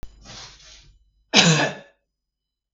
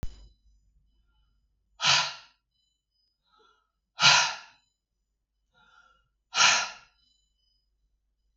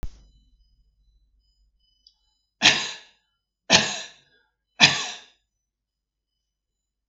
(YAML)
cough_length: 2.7 s
cough_amplitude: 32766
cough_signal_mean_std_ratio: 0.32
exhalation_length: 8.4 s
exhalation_amplitude: 18806
exhalation_signal_mean_std_ratio: 0.27
three_cough_length: 7.1 s
three_cough_amplitude: 32766
three_cough_signal_mean_std_ratio: 0.24
survey_phase: beta (2021-08-13 to 2022-03-07)
age: 45-64
gender: Female
wearing_mask: 'No'
symptom_none: true
smoker_status: Never smoked
respiratory_condition_asthma: false
respiratory_condition_other: false
recruitment_source: REACT
submission_delay: 2 days
covid_test_result: Negative
covid_test_method: RT-qPCR
influenza_a_test_result: Negative
influenza_b_test_result: Negative